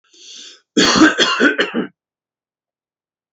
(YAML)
cough_length: 3.3 s
cough_amplitude: 32688
cough_signal_mean_std_ratio: 0.44
survey_phase: beta (2021-08-13 to 2022-03-07)
age: 45-64
gender: Male
wearing_mask: 'No'
symptom_none: true
smoker_status: Never smoked
respiratory_condition_asthma: false
respiratory_condition_other: false
recruitment_source: REACT
submission_delay: 5 days
covid_test_result: Negative
covid_test_method: RT-qPCR
influenza_a_test_result: Negative
influenza_b_test_result: Negative